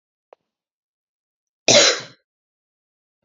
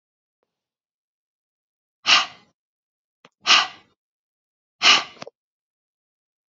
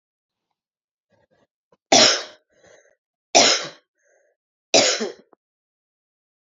{"cough_length": "3.2 s", "cough_amplitude": 30688, "cough_signal_mean_std_ratio": 0.24, "exhalation_length": "6.5 s", "exhalation_amplitude": 28081, "exhalation_signal_mean_std_ratio": 0.23, "three_cough_length": "6.6 s", "three_cough_amplitude": 30956, "three_cough_signal_mean_std_ratio": 0.28, "survey_phase": "beta (2021-08-13 to 2022-03-07)", "age": "45-64", "gender": "Female", "wearing_mask": "No", "symptom_cough_any": true, "symptom_runny_or_blocked_nose": true, "symptom_fatigue": true, "symptom_headache": true, "symptom_other": true, "symptom_onset": "2 days", "smoker_status": "Never smoked", "respiratory_condition_asthma": false, "respiratory_condition_other": false, "recruitment_source": "Test and Trace", "submission_delay": "2 days", "covid_test_result": "Positive", "covid_test_method": "RT-qPCR", "covid_ct_value": 21.6, "covid_ct_gene": "N gene"}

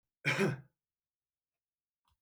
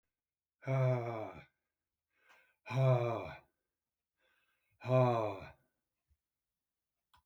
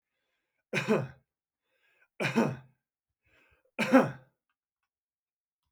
{"cough_length": "2.2 s", "cough_amplitude": 4486, "cough_signal_mean_std_ratio": 0.3, "exhalation_length": "7.3 s", "exhalation_amplitude": 4299, "exhalation_signal_mean_std_ratio": 0.37, "three_cough_length": "5.7 s", "three_cough_amplitude": 11747, "three_cough_signal_mean_std_ratio": 0.28, "survey_phase": "beta (2021-08-13 to 2022-03-07)", "age": "65+", "gender": "Male", "wearing_mask": "No", "symptom_none": true, "smoker_status": "Never smoked", "respiratory_condition_asthma": false, "respiratory_condition_other": false, "recruitment_source": "REACT", "submission_delay": "4 days", "covid_test_result": "Negative", "covid_test_method": "RT-qPCR"}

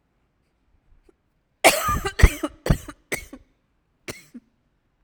{"cough_length": "5.0 s", "cough_amplitude": 32768, "cough_signal_mean_std_ratio": 0.26, "survey_phase": "alpha (2021-03-01 to 2021-08-12)", "age": "45-64", "gender": "Female", "wearing_mask": "No", "symptom_cough_any": true, "symptom_fatigue": true, "symptom_headache": true, "symptom_change_to_sense_of_smell_or_taste": true, "smoker_status": "Never smoked", "respiratory_condition_asthma": false, "respiratory_condition_other": false, "recruitment_source": "Test and Trace", "submission_delay": "2 days", "covid_test_result": "Positive", "covid_test_method": "RT-qPCR", "covid_ct_value": 28.5, "covid_ct_gene": "ORF1ab gene", "covid_ct_mean": 28.8, "covid_viral_load": "360 copies/ml", "covid_viral_load_category": "Minimal viral load (< 10K copies/ml)"}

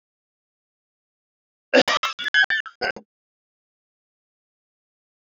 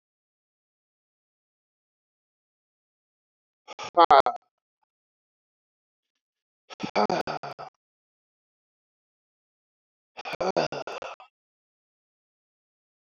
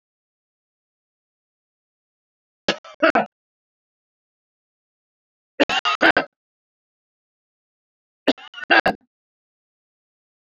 {"cough_length": "5.3 s", "cough_amplitude": 25302, "cough_signal_mean_std_ratio": 0.26, "exhalation_length": "13.1 s", "exhalation_amplitude": 20203, "exhalation_signal_mean_std_ratio": 0.19, "three_cough_length": "10.6 s", "three_cough_amplitude": 27781, "three_cough_signal_mean_std_ratio": 0.21, "survey_phase": "beta (2021-08-13 to 2022-03-07)", "age": "45-64", "gender": "Male", "wearing_mask": "No", "symptom_shortness_of_breath": true, "symptom_fatigue": true, "symptom_headache": true, "smoker_status": "Never smoked", "respiratory_condition_asthma": true, "respiratory_condition_other": false, "recruitment_source": "REACT", "submission_delay": "1 day", "covid_test_result": "Negative", "covid_test_method": "RT-qPCR"}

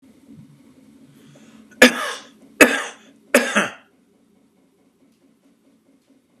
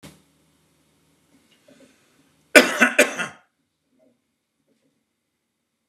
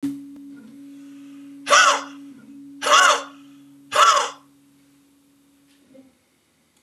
{"three_cough_length": "6.4 s", "three_cough_amplitude": 32768, "three_cough_signal_mean_std_ratio": 0.24, "cough_length": "5.9 s", "cough_amplitude": 32768, "cough_signal_mean_std_ratio": 0.2, "exhalation_length": "6.8 s", "exhalation_amplitude": 26895, "exhalation_signal_mean_std_ratio": 0.37, "survey_phase": "beta (2021-08-13 to 2022-03-07)", "age": "45-64", "gender": "Male", "wearing_mask": "No", "symptom_none": true, "smoker_status": "Ex-smoker", "respiratory_condition_asthma": false, "respiratory_condition_other": false, "recruitment_source": "REACT", "submission_delay": "1 day", "covid_test_result": "Negative", "covid_test_method": "RT-qPCR", "covid_ct_value": 43.0, "covid_ct_gene": "N gene"}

